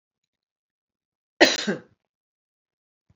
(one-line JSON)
{"three_cough_length": "3.2 s", "three_cough_amplitude": 28793, "three_cough_signal_mean_std_ratio": 0.2, "survey_phase": "alpha (2021-03-01 to 2021-08-12)", "age": "65+", "gender": "Female", "wearing_mask": "No", "symptom_none": true, "smoker_status": "Ex-smoker", "respiratory_condition_asthma": false, "respiratory_condition_other": false, "recruitment_source": "REACT", "submission_delay": "1 day", "covid_test_result": "Negative", "covid_test_method": "RT-qPCR"}